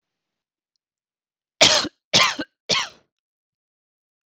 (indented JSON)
{
  "three_cough_length": "4.3 s",
  "three_cough_amplitude": 26019,
  "three_cough_signal_mean_std_ratio": 0.28,
  "survey_phase": "beta (2021-08-13 to 2022-03-07)",
  "age": "18-44",
  "gender": "Female",
  "wearing_mask": "No",
  "symptom_none": true,
  "smoker_status": "Never smoked",
  "respiratory_condition_asthma": true,
  "respiratory_condition_other": false,
  "recruitment_source": "REACT",
  "submission_delay": "2 days",
  "covid_test_result": "Negative",
  "covid_test_method": "RT-qPCR",
  "influenza_a_test_result": "Unknown/Void",
  "influenza_b_test_result": "Unknown/Void"
}